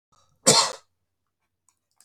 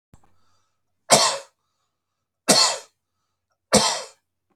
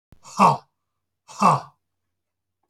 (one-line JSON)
{"cough_length": "2.0 s", "cough_amplitude": 32346, "cough_signal_mean_std_ratio": 0.26, "three_cough_length": "4.6 s", "three_cough_amplitude": 32405, "three_cough_signal_mean_std_ratio": 0.32, "exhalation_length": "2.7 s", "exhalation_amplitude": 24438, "exhalation_signal_mean_std_ratio": 0.3, "survey_phase": "beta (2021-08-13 to 2022-03-07)", "age": "65+", "gender": "Male", "wearing_mask": "No", "symptom_none": true, "smoker_status": "Never smoked", "respiratory_condition_asthma": false, "respiratory_condition_other": false, "recruitment_source": "REACT", "submission_delay": "1 day", "covid_test_result": "Negative", "covid_test_method": "RT-qPCR"}